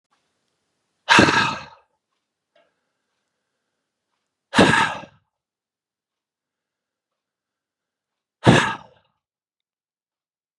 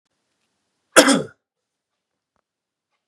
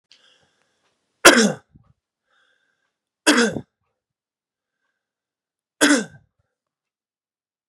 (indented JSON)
{
  "exhalation_length": "10.6 s",
  "exhalation_amplitude": 32767,
  "exhalation_signal_mean_std_ratio": 0.24,
  "cough_length": "3.1 s",
  "cough_amplitude": 32768,
  "cough_signal_mean_std_ratio": 0.21,
  "three_cough_length": "7.7 s",
  "three_cough_amplitude": 32768,
  "three_cough_signal_mean_std_ratio": 0.23,
  "survey_phase": "beta (2021-08-13 to 2022-03-07)",
  "age": "45-64",
  "gender": "Male",
  "wearing_mask": "No",
  "symptom_none": true,
  "smoker_status": "Never smoked",
  "respiratory_condition_asthma": false,
  "respiratory_condition_other": false,
  "recruitment_source": "REACT",
  "submission_delay": "1 day",
  "covid_test_result": "Negative",
  "covid_test_method": "RT-qPCR",
  "influenza_a_test_result": "Negative",
  "influenza_b_test_result": "Negative"
}